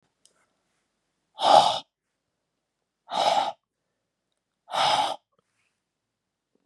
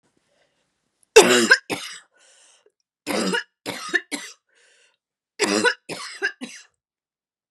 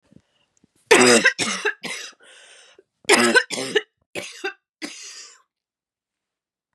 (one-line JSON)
{"exhalation_length": "6.7 s", "exhalation_amplitude": 24381, "exhalation_signal_mean_std_ratio": 0.31, "three_cough_length": "7.5 s", "three_cough_amplitude": 32768, "three_cough_signal_mean_std_ratio": 0.31, "cough_length": "6.7 s", "cough_amplitude": 32768, "cough_signal_mean_std_ratio": 0.35, "survey_phase": "beta (2021-08-13 to 2022-03-07)", "age": "18-44", "gender": "Female", "wearing_mask": "No", "symptom_cough_any": true, "symptom_runny_or_blocked_nose": true, "symptom_sore_throat": true, "symptom_fatigue": true, "symptom_headache": true, "smoker_status": "Never smoked", "respiratory_condition_asthma": false, "respiratory_condition_other": false, "recruitment_source": "Test and Trace", "submission_delay": "2 days", "covid_test_result": "Positive", "covid_test_method": "RT-qPCR", "covid_ct_value": 33.5, "covid_ct_gene": "ORF1ab gene"}